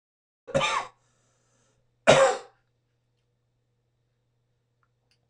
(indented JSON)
{
  "cough_length": "5.3 s",
  "cough_amplitude": 22912,
  "cough_signal_mean_std_ratio": 0.24,
  "survey_phase": "alpha (2021-03-01 to 2021-08-12)",
  "age": "65+",
  "gender": "Male",
  "wearing_mask": "No",
  "symptom_cough_any": true,
  "symptom_fatigue": true,
  "symptom_onset": "6 days",
  "smoker_status": "Never smoked",
  "respiratory_condition_asthma": false,
  "respiratory_condition_other": false,
  "recruitment_source": "REACT",
  "submission_delay": "1 day",
  "covid_test_result": "Negative",
  "covid_test_method": "RT-qPCR"
}